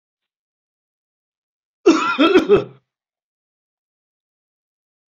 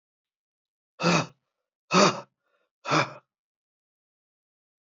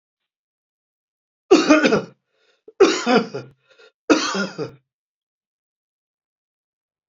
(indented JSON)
{
  "cough_length": "5.1 s",
  "cough_amplitude": 27538,
  "cough_signal_mean_std_ratio": 0.29,
  "exhalation_length": "4.9 s",
  "exhalation_amplitude": 19210,
  "exhalation_signal_mean_std_ratio": 0.28,
  "three_cough_length": "7.1 s",
  "three_cough_amplitude": 27783,
  "three_cough_signal_mean_std_ratio": 0.32,
  "survey_phase": "beta (2021-08-13 to 2022-03-07)",
  "age": "45-64",
  "gender": "Male",
  "wearing_mask": "No",
  "symptom_runny_or_blocked_nose": true,
  "symptom_onset": "3 days",
  "smoker_status": "Never smoked",
  "respiratory_condition_asthma": false,
  "respiratory_condition_other": false,
  "recruitment_source": "Test and Trace",
  "submission_delay": "1 day",
  "covid_test_result": "Positive",
  "covid_test_method": "RT-qPCR",
  "covid_ct_value": 22.8,
  "covid_ct_gene": "ORF1ab gene"
}